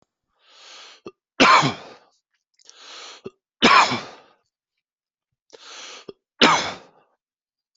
{
  "three_cough_length": "7.8 s",
  "three_cough_amplitude": 28858,
  "three_cough_signal_mean_std_ratio": 0.29,
  "survey_phase": "alpha (2021-03-01 to 2021-08-12)",
  "age": "45-64",
  "gender": "Male",
  "wearing_mask": "No",
  "symptom_none": true,
  "symptom_onset": "13 days",
  "smoker_status": "Never smoked",
  "respiratory_condition_asthma": false,
  "respiratory_condition_other": false,
  "recruitment_source": "REACT",
  "submission_delay": "3 days",
  "covid_test_result": "Negative",
  "covid_test_method": "RT-qPCR"
}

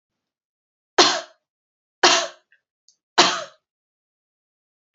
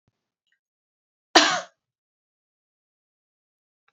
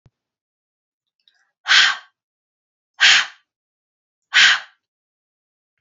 {
  "three_cough_length": "4.9 s",
  "three_cough_amplitude": 31771,
  "three_cough_signal_mean_std_ratio": 0.26,
  "cough_length": "3.9 s",
  "cough_amplitude": 28884,
  "cough_signal_mean_std_ratio": 0.17,
  "exhalation_length": "5.8 s",
  "exhalation_amplitude": 32768,
  "exhalation_signal_mean_std_ratio": 0.28,
  "survey_phase": "beta (2021-08-13 to 2022-03-07)",
  "age": "18-44",
  "gender": "Female",
  "wearing_mask": "No",
  "symptom_fever_high_temperature": true,
  "symptom_onset": "2 days",
  "smoker_status": "Ex-smoker",
  "respiratory_condition_asthma": false,
  "respiratory_condition_other": false,
  "recruitment_source": "Test and Trace",
  "submission_delay": "1 day",
  "covid_test_result": "Negative",
  "covid_test_method": "RT-qPCR"
}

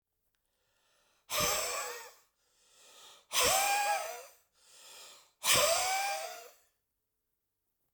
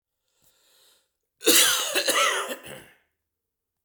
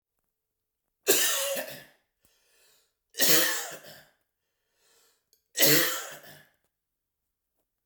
{
  "exhalation_length": "7.9 s",
  "exhalation_amplitude": 7325,
  "exhalation_signal_mean_std_ratio": 0.46,
  "cough_length": "3.8 s",
  "cough_amplitude": 17893,
  "cough_signal_mean_std_ratio": 0.41,
  "three_cough_length": "7.9 s",
  "three_cough_amplitude": 16796,
  "three_cough_signal_mean_std_ratio": 0.34,
  "survey_phase": "beta (2021-08-13 to 2022-03-07)",
  "age": "45-64",
  "gender": "Male",
  "wearing_mask": "No",
  "symptom_shortness_of_breath": true,
  "smoker_status": "Ex-smoker",
  "respiratory_condition_asthma": false,
  "respiratory_condition_other": false,
  "recruitment_source": "REACT",
  "submission_delay": "2 days",
  "covid_test_result": "Negative",
  "covid_test_method": "RT-qPCR"
}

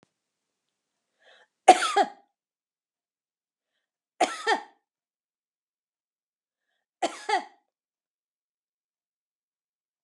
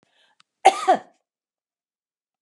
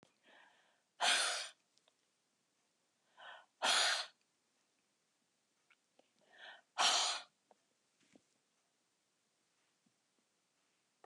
{
  "three_cough_length": "10.0 s",
  "three_cough_amplitude": 27761,
  "three_cough_signal_mean_std_ratio": 0.18,
  "cough_length": "2.4 s",
  "cough_amplitude": 31521,
  "cough_signal_mean_std_ratio": 0.22,
  "exhalation_length": "11.1 s",
  "exhalation_amplitude": 3486,
  "exhalation_signal_mean_std_ratio": 0.29,
  "survey_phase": "beta (2021-08-13 to 2022-03-07)",
  "age": "65+",
  "gender": "Female",
  "wearing_mask": "No",
  "symptom_fatigue": true,
  "smoker_status": "Never smoked",
  "respiratory_condition_asthma": false,
  "respiratory_condition_other": false,
  "recruitment_source": "REACT",
  "submission_delay": "0 days",
  "covid_test_result": "Negative",
  "covid_test_method": "RT-qPCR",
  "influenza_a_test_result": "Negative",
  "influenza_b_test_result": "Negative"
}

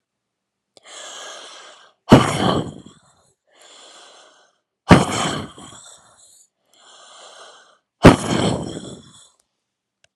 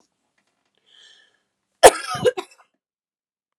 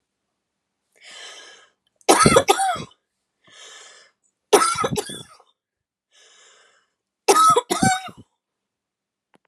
{
  "exhalation_length": "10.2 s",
  "exhalation_amplitude": 32768,
  "exhalation_signal_mean_std_ratio": 0.27,
  "cough_length": "3.6 s",
  "cough_amplitude": 32768,
  "cough_signal_mean_std_ratio": 0.18,
  "three_cough_length": "9.5 s",
  "three_cough_amplitude": 32766,
  "three_cough_signal_mean_std_ratio": 0.33,
  "survey_phase": "beta (2021-08-13 to 2022-03-07)",
  "age": "18-44",
  "gender": "Female",
  "wearing_mask": "No",
  "symptom_sore_throat": true,
  "symptom_fatigue": true,
  "symptom_headache": true,
  "symptom_onset": "11 days",
  "smoker_status": "Never smoked",
  "respiratory_condition_asthma": false,
  "respiratory_condition_other": false,
  "recruitment_source": "REACT",
  "submission_delay": "0 days",
  "covid_test_result": "Negative",
  "covid_test_method": "RT-qPCR"
}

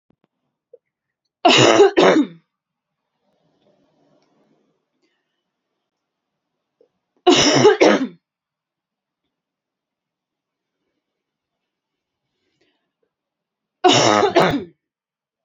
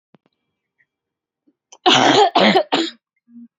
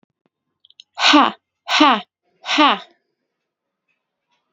{
  "three_cough_length": "15.4 s",
  "three_cough_amplitude": 32767,
  "three_cough_signal_mean_std_ratio": 0.3,
  "cough_length": "3.6 s",
  "cough_amplitude": 30063,
  "cough_signal_mean_std_ratio": 0.41,
  "exhalation_length": "4.5 s",
  "exhalation_amplitude": 31701,
  "exhalation_signal_mean_std_ratio": 0.34,
  "survey_phase": "alpha (2021-03-01 to 2021-08-12)",
  "age": "18-44",
  "gender": "Female",
  "wearing_mask": "No",
  "symptom_fatigue": true,
  "symptom_headache": true,
  "smoker_status": "Never smoked",
  "respiratory_condition_asthma": false,
  "respiratory_condition_other": false,
  "recruitment_source": "REACT",
  "submission_delay": "0 days",
  "covid_test_result": "Negative",
  "covid_test_method": "RT-qPCR"
}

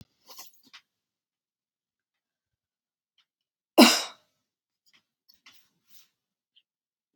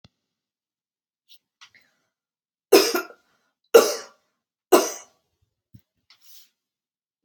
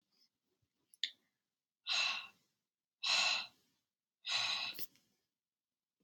{
  "cough_length": "7.2 s",
  "cough_amplitude": 27036,
  "cough_signal_mean_std_ratio": 0.14,
  "three_cough_length": "7.2 s",
  "three_cough_amplitude": 30237,
  "three_cough_signal_mean_std_ratio": 0.2,
  "exhalation_length": "6.0 s",
  "exhalation_amplitude": 4483,
  "exhalation_signal_mean_std_ratio": 0.38,
  "survey_phase": "beta (2021-08-13 to 2022-03-07)",
  "age": "45-64",
  "gender": "Female",
  "wearing_mask": "No",
  "symptom_sore_throat": true,
  "symptom_fatigue": true,
  "smoker_status": "Never smoked",
  "respiratory_condition_asthma": false,
  "respiratory_condition_other": false,
  "recruitment_source": "Test and Trace",
  "submission_delay": "3 days",
  "covid_test_result": "Positive",
  "covid_test_method": "RT-qPCR",
  "covid_ct_value": 25.0,
  "covid_ct_gene": "ORF1ab gene",
  "covid_ct_mean": 26.8,
  "covid_viral_load": "1700 copies/ml",
  "covid_viral_load_category": "Minimal viral load (< 10K copies/ml)"
}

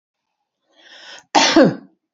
{
  "cough_length": "2.1 s",
  "cough_amplitude": 30742,
  "cough_signal_mean_std_ratio": 0.35,
  "survey_phase": "beta (2021-08-13 to 2022-03-07)",
  "age": "45-64",
  "gender": "Female",
  "wearing_mask": "No",
  "symptom_none": true,
  "smoker_status": "Never smoked",
  "respiratory_condition_asthma": false,
  "respiratory_condition_other": false,
  "recruitment_source": "REACT",
  "submission_delay": "2 days",
  "covid_test_result": "Negative",
  "covid_test_method": "RT-qPCR",
  "influenza_a_test_result": "Negative",
  "influenza_b_test_result": "Negative"
}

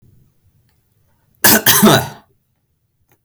{
  "cough_length": "3.2 s",
  "cough_amplitude": 32768,
  "cough_signal_mean_std_ratio": 0.35,
  "survey_phase": "beta (2021-08-13 to 2022-03-07)",
  "age": "18-44",
  "gender": "Male",
  "wearing_mask": "No",
  "symptom_none": true,
  "smoker_status": "Never smoked",
  "respiratory_condition_asthma": false,
  "respiratory_condition_other": false,
  "recruitment_source": "REACT",
  "submission_delay": "1 day",
  "covid_test_result": "Negative",
  "covid_test_method": "RT-qPCR",
  "influenza_a_test_result": "Negative",
  "influenza_b_test_result": "Negative"
}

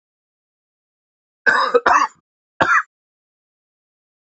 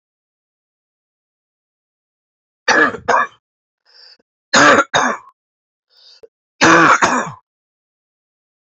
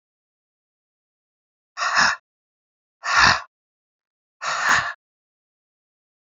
{
  "cough_length": "4.4 s",
  "cough_amplitude": 28242,
  "cough_signal_mean_std_ratio": 0.33,
  "three_cough_length": "8.6 s",
  "three_cough_amplitude": 29927,
  "three_cough_signal_mean_std_ratio": 0.34,
  "exhalation_length": "6.3 s",
  "exhalation_amplitude": 28804,
  "exhalation_signal_mean_std_ratio": 0.32,
  "survey_phase": "beta (2021-08-13 to 2022-03-07)",
  "age": "45-64",
  "gender": "Male",
  "wearing_mask": "Yes",
  "symptom_new_continuous_cough": true,
  "symptom_runny_or_blocked_nose": true,
  "symptom_sore_throat": true,
  "symptom_fatigue": true,
  "symptom_headache": true,
  "symptom_onset": "2 days",
  "smoker_status": "Never smoked",
  "respiratory_condition_asthma": false,
  "respiratory_condition_other": false,
  "recruitment_source": "Test and Trace",
  "submission_delay": "2 days",
  "covid_test_result": "Positive",
  "covid_test_method": "RT-qPCR",
  "covid_ct_value": 19.5,
  "covid_ct_gene": "S gene"
}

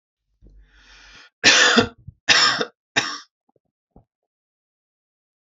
{
  "three_cough_length": "5.5 s",
  "three_cough_amplitude": 30825,
  "three_cough_signal_mean_std_ratio": 0.32,
  "survey_phase": "beta (2021-08-13 to 2022-03-07)",
  "age": "18-44",
  "gender": "Male",
  "wearing_mask": "No",
  "symptom_none": true,
  "smoker_status": "Never smoked",
  "respiratory_condition_asthma": false,
  "respiratory_condition_other": false,
  "recruitment_source": "REACT",
  "submission_delay": "1 day",
  "covid_test_result": "Negative",
  "covid_test_method": "RT-qPCR",
  "influenza_a_test_result": "Negative",
  "influenza_b_test_result": "Negative"
}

